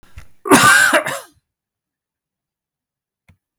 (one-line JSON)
{"cough_length": "3.6 s", "cough_amplitude": 32768, "cough_signal_mean_std_ratio": 0.35, "survey_phase": "beta (2021-08-13 to 2022-03-07)", "age": "45-64", "gender": "Male", "wearing_mask": "No", "symptom_sore_throat": true, "smoker_status": "Never smoked", "respiratory_condition_asthma": false, "respiratory_condition_other": false, "recruitment_source": "REACT", "submission_delay": "2 days", "covid_test_result": "Negative", "covid_test_method": "RT-qPCR", "influenza_a_test_result": "Negative", "influenza_b_test_result": "Negative"}